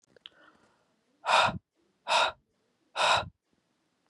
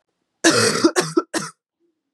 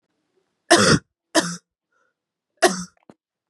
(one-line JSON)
{"exhalation_length": "4.1 s", "exhalation_amplitude": 10346, "exhalation_signal_mean_std_ratio": 0.36, "cough_length": "2.1 s", "cough_amplitude": 28015, "cough_signal_mean_std_ratio": 0.46, "three_cough_length": "3.5 s", "three_cough_amplitude": 30768, "three_cough_signal_mean_std_ratio": 0.31, "survey_phase": "beta (2021-08-13 to 2022-03-07)", "age": "18-44", "gender": "Female", "wearing_mask": "No", "symptom_none": true, "symptom_onset": "8 days", "smoker_status": "Current smoker (e-cigarettes or vapes only)", "respiratory_condition_asthma": false, "respiratory_condition_other": false, "recruitment_source": "REACT", "submission_delay": "6 days", "covid_test_result": "Positive", "covid_test_method": "RT-qPCR", "covid_ct_value": 21.4, "covid_ct_gene": "E gene", "influenza_a_test_result": "Negative", "influenza_b_test_result": "Negative"}